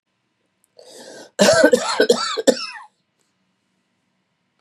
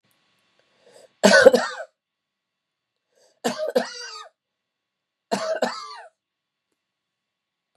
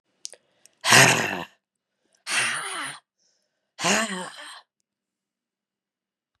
{"cough_length": "4.6 s", "cough_amplitude": 32584, "cough_signal_mean_std_ratio": 0.36, "three_cough_length": "7.8 s", "three_cough_amplitude": 32767, "three_cough_signal_mean_std_ratio": 0.26, "exhalation_length": "6.4 s", "exhalation_amplitude": 31050, "exhalation_signal_mean_std_ratio": 0.33, "survey_phase": "beta (2021-08-13 to 2022-03-07)", "age": "45-64", "gender": "Female", "wearing_mask": "No", "symptom_cough_any": true, "symptom_runny_or_blocked_nose": true, "symptom_sore_throat": true, "symptom_onset": "4 days", "smoker_status": "Never smoked", "respiratory_condition_asthma": false, "respiratory_condition_other": false, "recruitment_source": "Test and Trace", "submission_delay": "2 days", "covid_test_result": "Positive", "covid_test_method": "RT-qPCR", "covid_ct_value": 15.0, "covid_ct_gene": "ORF1ab gene", "covid_ct_mean": 15.0, "covid_viral_load": "12000000 copies/ml", "covid_viral_load_category": "High viral load (>1M copies/ml)"}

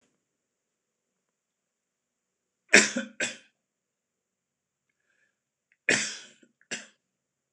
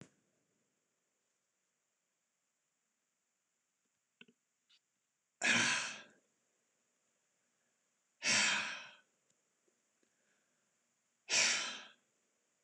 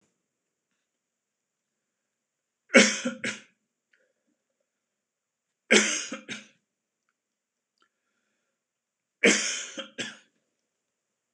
{"cough_length": "7.5 s", "cough_amplitude": 26028, "cough_signal_mean_std_ratio": 0.18, "exhalation_length": "12.6 s", "exhalation_amplitude": 4439, "exhalation_signal_mean_std_ratio": 0.27, "three_cough_length": "11.3 s", "three_cough_amplitude": 25356, "three_cough_signal_mean_std_ratio": 0.23, "survey_phase": "beta (2021-08-13 to 2022-03-07)", "age": "65+", "gender": "Male", "wearing_mask": "No", "symptom_fatigue": true, "symptom_headache": true, "symptom_other": true, "symptom_onset": "10 days", "smoker_status": "Never smoked", "respiratory_condition_asthma": true, "respiratory_condition_other": false, "recruitment_source": "REACT", "submission_delay": "1 day", "covid_test_result": "Negative", "covid_test_method": "RT-qPCR", "influenza_a_test_result": "Unknown/Void", "influenza_b_test_result": "Unknown/Void"}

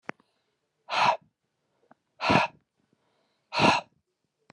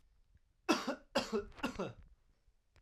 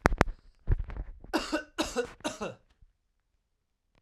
{"exhalation_length": "4.5 s", "exhalation_amplitude": 13839, "exhalation_signal_mean_std_ratio": 0.32, "three_cough_length": "2.8 s", "three_cough_amplitude": 4535, "three_cough_signal_mean_std_ratio": 0.41, "cough_length": "4.0 s", "cough_amplitude": 32768, "cough_signal_mean_std_ratio": 0.37, "survey_phase": "alpha (2021-03-01 to 2021-08-12)", "age": "18-44", "gender": "Male", "wearing_mask": "No", "symptom_none": true, "smoker_status": "Never smoked", "respiratory_condition_asthma": true, "respiratory_condition_other": false, "recruitment_source": "REACT", "submission_delay": "1 day", "covid_test_result": "Negative", "covid_test_method": "RT-qPCR"}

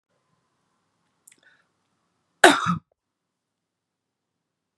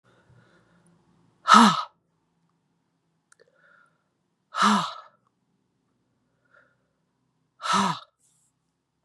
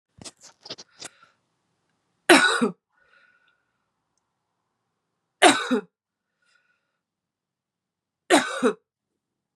{"cough_length": "4.8 s", "cough_amplitude": 32768, "cough_signal_mean_std_ratio": 0.16, "exhalation_length": "9.0 s", "exhalation_amplitude": 30645, "exhalation_signal_mean_std_ratio": 0.24, "three_cough_length": "9.6 s", "three_cough_amplitude": 30448, "three_cough_signal_mean_std_ratio": 0.25, "survey_phase": "beta (2021-08-13 to 2022-03-07)", "age": "45-64", "gender": "Female", "wearing_mask": "No", "symptom_runny_or_blocked_nose": true, "symptom_sore_throat": true, "symptom_fatigue": true, "symptom_change_to_sense_of_smell_or_taste": true, "symptom_onset": "3 days", "smoker_status": "Never smoked", "respiratory_condition_asthma": false, "respiratory_condition_other": false, "recruitment_source": "Test and Trace", "submission_delay": "2 days", "covid_test_result": "Positive", "covid_test_method": "RT-qPCR", "covid_ct_value": 22.1, "covid_ct_gene": "ORF1ab gene", "covid_ct_mean": 22.2, "covid_viral_load": "52000 copies/ml", "covid_viral_load_category": "Low viral load (10K-1M copies/ml)"}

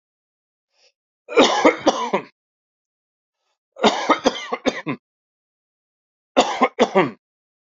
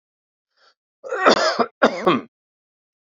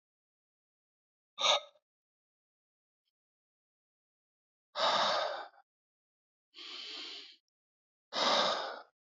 {"three_cough_length": "7.7 s", "three_cough_amplitude": 32741, "three_cough_signal_mean_std_ratio": 0.36, "cough_length": "3.1 s", "cough_amplitude": 27579, "cough_signal_mean_std_ratio": 0.38, "exhalation_length": "9.1 s", "exhalation_amplitude": 5583, "exhalation_signal_mean_std_ratio": 0.34, "survey_phase": "beta (2021-08-13 to 2022-03-07)", "age": "65+", "gender": "Male", "wearing_mask": "No", "symptom_none": true, "smoker_status": "Never smoked", "respiratory_condition_asthma": false, "respiratory_condition_other": false, "recruitment_source": "REACT", "submission_delay": "3 days", "covid_test_result": "Negative", "covid_test_method": "RT-qPCR", "influenza_a_test_result": "Negative", "influenza_b_test_result": "Negative"}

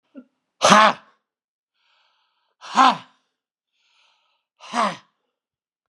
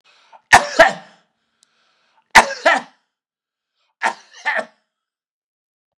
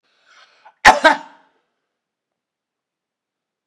{"exhalation_length": "5.9 s", "exhalation_amplitude": 32650, "exhalation_signal_mean_std_ratio": 0.26, "three_cough_length": "6.0 s", "three_cough_amplitude": 32768, "three_cough_signal_mean_std_ratio": 0.26, "cough_length": "3.7 s", "cough_amplitude": 32768, "cough_signal_mean_std_ratio": 0.19, "survey_phase": "beta (2021-08-13 to 2022-03-07)", "age": "65+", "gender": "Male", "wearing_mask": "No", "symptom_none": true, "smoker_status": "Ex-smoker", "respiratory_condition_asthma": false, "respiratory_condition_other": false, "recruitment_source": "REACT", "submission_delay": "2 days", "covid_test_result": "Negative", "covid_test_method": "RT-qPCR", "influenza_a_test_result": "Negative", "influenza_b_test_result": "Negative"}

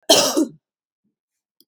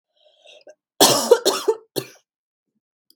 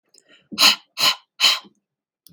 {"cough_length": "1.7 s", "cough_amplitude": 32767, "cough_signal_mean_std_ratio": 0.35, "three_cough_length": "3.2 s", "three_cough_amplitude": 32767, "three_cough_signal_mean_std_ratio": 0.33, "exhalation_length": "2.3 s", "exhalation_amplitude": 32768, "exhalation_signal_mean_std_ratio": 0.37, "survey_phase": "beta (2021-08-13 to 2022-03-07)", "age": "18-44", "gender": "Female", "wearing_mask": "No", "symptom_none": true, "smoker_status": "Current smoker (e-cigarettes or vapes only)", "respiratory_condition_asthma": false, "respiratory_condition_other": false, "recruitment_source": "REACT", "submission_delay": "1 day", "covid_test_result": "Negative", "covid_test_method": "RT-qPCR", "influenza_a_test_result": "Negative", "influenza_b_test_result": "Negative"}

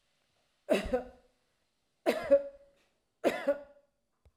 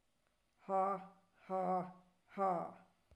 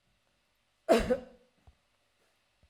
{"three_cough_length": "4.4 s", "three_cough_amplitude": 6660, "three_cough_signal_mean_std_ratio": 0.34, "exhalation_length": "3.2 s", "exhalation_amplitude": 1877, "exhalation_signal_mean_std_ratio": 0.5, "cough_length": "2.7 s", "cough_amplitude": 8587, "cough_signal_mean_std_ratio": 0.26, "survey_phase": "alpha (2021-03-01 to 2021-08-12)", "age": "65+", "gender": "Female", "wearing_mask": "No", "symptom_none": true, "smoker_status": "Ex-smoker", "respiratory_condition_asthma": false, "respiratory_condition_other": false, "recruitment_source": "REACT", "submission_delay": "2 days", "covid_test_result": "Negative", "covid_test_method": "RT-qPCR"}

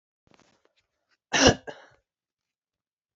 {"cough_length": "3.2 s", "cough_amplitude": 21744, "cough_signal_mean_std_ratio": 0.2, "survey_phase": "beta (2021-08-13 to 2022-03-07)", "age": "45-64", "gender": "Female", "wearing_mask": "No", "symptom_runny_or_blocked_nose": true, "symptom_headache": true, "symptom_change_to_sense_of_smell_or_taste": true, "symptom_onset": "3 days", "smoker_status": "Ex-smoker", "respiratory_condition_asthma": false, "respiratory_condition_other": false, "recruitment_source": "Test and Trace", "submission_delay": "2 days", "covid_test_result": "Positive", "covid_test_method": "RT-qPCR", "covid_ct_value": 23.9, "covid_ct_gene": "ORF1ab gene", "covid_ct_mean": 24.2, "covid_viral_load": "11000 copies/ml", "covid_viral_load_category": "Low viral load (10K-1M copies/ml)"}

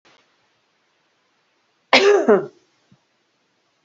{"cough_length": "3.8 s", "cough_amplitude": 30507, "cough_signal_mean_std_ratio": 0.28, "survey_phase": "beta (2021-08-13 to 2022-03-07)", "age": "45-64", "gender": "Female", "wearing_mask": "No", "symptom_cough_any": true, "symptom_runny_or_blocked_nose": true, "symptom_shortness_of_breath": true, "symptom_fatigue": true, "symptom_change_to_sense_of_smell_or_taste": true, "smoker_status": "Never smoked", "respiratory_condition_asthma": false, "respiratory_condition_other": false, "recruitment_source": "Test and Trace", "submission_delay": "2 days", "covid_test_result": "Positive", "covid_test_method": "RT-qPCR", "covid_ct_value": 13.6, "covid_ct_gene": "ORF1ab gene", "covid_ct_mean": 13.7, "covid_viral_load": "32000000 copies/ml", "covid_viral_load_category": "High viral load (>1M copies/ml)"}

